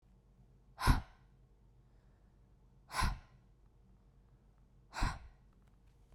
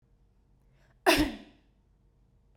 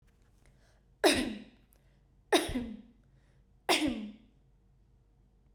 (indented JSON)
{
  "exhalation_length": "6.1 s",
  "exhalation_amplitude": 6047,
  "exhalation_signal_mean_std_ratio": 0.28,
  "cough_length": "2.6 s",
  "cough_amplitude": 12504,
  "cough_signal_mean_std_ratio": 0.26,
  "three_cough_length": "5.5 s",
  "three_cough_amplitude": 9260,
  "three_cough_signal_mean_std_ratio": 0.34,
  "survey_phase": "beta (2021-08-13 to 2022-03-07)",
  "age": "18-44",
  "gender": "Female",
  "wearing_mask": "No",
  "symptom_sore_throat": true,
  "smoker_status": "Never smoked",
  "respiratory_condition_asthma": false,
  "respiratory_condition_other": false,
  "recruitment_source": "REACT",
  "submission_delay": "1 day",
  "covid_test_result": "Negative",
  "covid_test_method": "RT-qPCR",
  "influenza_a_test_result": "Negative",
  "influenza_b_test_result": "Negative"
}